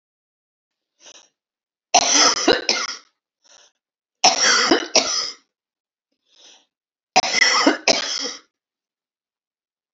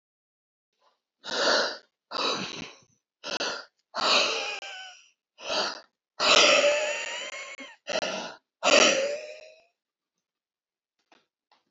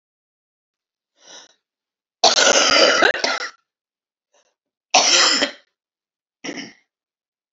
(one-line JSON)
{"three_cough_length": "9.9 s", "three_cough_amplitude": 31688, "three_cough_signal_mean_std_ratio": 0.39, "exhalation_length": "11.7 s", "exhalation_amplitude": 16727, "exhalation_signal_mean_std_ratio": 0.45, "cough_length": "7.5 s", "cough_amplitude": 32767, "cough_signal_mean_std_ratio": 0.38, "survey_phase": "alpha (2021-03-01 to 2021-08-12)", "age": "65+", "gender": "Female", "wearing_mask": "No", "symptom_cough_any": true, "smoker_status": "Ex-smoker", "respiratory_condition_asthma": false, "respiratory_condition_other": false, "recruitment_source": "REACT", "submission_delay": "1 day", "covid_test_result": "Negative", "covid_test_method": "RT-qPCR"}